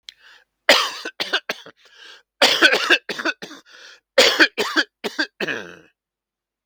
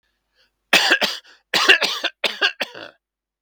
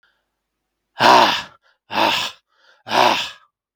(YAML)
three_cough_length: 6.7 s
three_cough_amplitude: 32768
three_cough_signal_mean_std_ratio: 0.4
cough_length: 3.4 s
cough_amplitude: 32768
cough_signal_mean_std_ratio: 0.42
exhalation_length: 3.8 s
exhalation_amplitude: 32768
exhalation_signal_mean_std_ratio: 0.41
survey_phase: beta (2021-08-13 to 2022-03-07)
age: 65+
gender: Male
wearing_mask: 'No'
symptom_sore_throat: true
symptom_fatigue: true
symptom_headache: true
symptom_change_to_sense_of_smell_or_taste: true
symptom_loss_of_taste: true
symptom_onset: 4 days
smoker_status: Never smoked
respiratory_condition_asthma: false
respiratory_condition_other: false
recruitment_source: Test and Trace
submission_delay: 1 day
covid_test_result: Positive
covid_test_method: RT-qPCR
covid_ct_value: 14.0
covid_ct_gene: ORF1ab gene
covid_ct_mean: 14.2
covid_viral_load: 21000000 copies/ml
covid_viral_load_category: High viral load (>1M copies/ml)